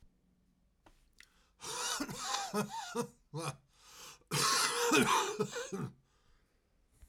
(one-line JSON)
{"cough_length": "7.1 s", "cough_amplitude": 5535, "cough_signal_mean_std_ratio": 0.52, "survey_phase": "alpha (2021-03-01 to 2021-08-12)", "age": "45-64", "gender": "Male", "wearing_mask": "No", "symptom_fatigue": true, "symptom_headache": true, "symptom_change_to_sense_of_smell_or_taste": true, "symptom_loss_of_taste": true, "smoker_status": "Current smoker (1 to 10 cigarettes per day)", "respiratory_condition_asthma": false, "respiratory_condition_other": false, "recruitment_source": "Test and Trace", "submission_delay": "2 days", "covid_test_result": "Positive", "covid_test_method": "RT-qPCR", "covid_ct_value": 16.2, "covid_ct_gene": "ORF1ab gene", "covid_ct_mean": 16.8, "covid_viral_load": "3100000 copies/ml", "covid_viral_load_category": "High viral load (>1M copies/ml)"}